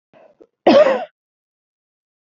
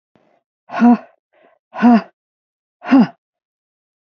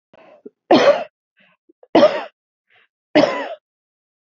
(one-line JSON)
{"cough_length": "2.3 s", "cough_amplitude": 27919, "cough_signal_mean_std_ratio": 0.31, "exhalation_length": "4.2 s", "exhalation_amplitude": 27316, "exhalation_signal_mean_std_ratio": 0.33, "three_cough_length": "4.4 s", "three_cough_amplitude": 28610, "three_cough_signal_mean_std_ratio": 0.33, "survey_phase": "beta (2021-08-13 to 2022-03-07)", "age": "45-64", "gender": "Female", "wearing_mask": "No", "symptom_none": true, "smoker_status": "Never smoked", "respiratory_condition_asthma": false, "respiratory_condition_other": false, "recruitment_source": "REACT", "submission_delay": "1 day", "covid_test_result": "Negative", "covid_test_method": "RT-qPCR"}